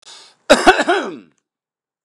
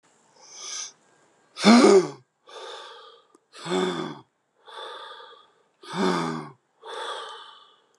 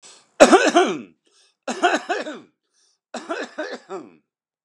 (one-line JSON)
{"cough_length": "2.0 s", "cough_amplitude": 32768, "cough_signal_mean_std_ratio": 0.36, "exhalation_length": "8.0 s", "exhalation_amplitude": 22735, "exhalation_signal_mean_std_ratio": 0.35, "three_cough_length": "4.6 s", "three_cough_amplitude": 32768, "three_cough_signal_mean_std_ratio": 0.35, "survey_phase": "beta (2021-08-13 to 2022-03-07)", "age": "45-64", "gender": "Male", "wearing_mask": "No", "symptom_none": true, "smoker_status": "Ex-smoker", "respiratory_condition_asthma": false, "respiratory_condition_other": false, "recruitment_source": "REACT", "submission_delay": "11 days", "covid_test_result": "Negative", "covid_test_method": "RT-qPCR", "covid_ct_value": 42.0, "covid_ct_gene": "N gene"}